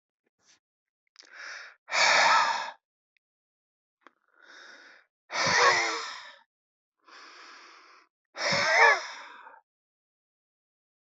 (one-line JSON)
{"exhalation_length": "11.0 s", "exhalation_amplitude": 14817, "exhalation_signal_mean_std_ratio": 0.37, "survey_phase": "beta (2021-08-13 to 2022-03-07)", "age": "65+", "gender": "Male", "wearing_mask": "No", "symptom_none": true, "smoker_status": "Never smoked", "respiratory_condition_asthma": true, "respiratory_condition_other": true, "recruitment_source": "REACT", "submission_delay": "2 days", "covid_test_result": "Negative", "covid_test_method": "RT-qPCR", "influenza_a_test_result": "Negative", "influenza_b_test_result": "Negative"}